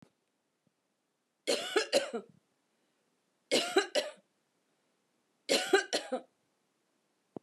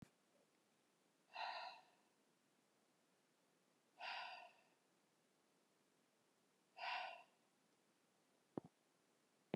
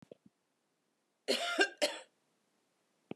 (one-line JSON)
{"three_cough_length": "7.4 s", "three_cough_amplitude": 7279, "three_cough_signal_mean_std_ratio": 0.33, "exhalation_length": "9.6 s", "exhalation_amplitude": 1330, "exhalation_signal_mean_std_ratio": 0.34, "cough_length": "3.2 s", "cough_amplitude": 7209, "cough_signal_mean_std_ratio": 0.31, "survey_phase": "beta (2021-08-13 to 2022-03-07)", "age": "45-64", "gender": "Female", "wearing_mask": "No", "symptom_none": true, "smoker_status": "Ex-smoker", "respiratory_condition_asthma": false, "respiratory_condition_other": false, "recruitment_source": "REACT", "submission_delay": "1 day", "covid_test_result": "Negative", "covid_test_method": "RT-qPCR"}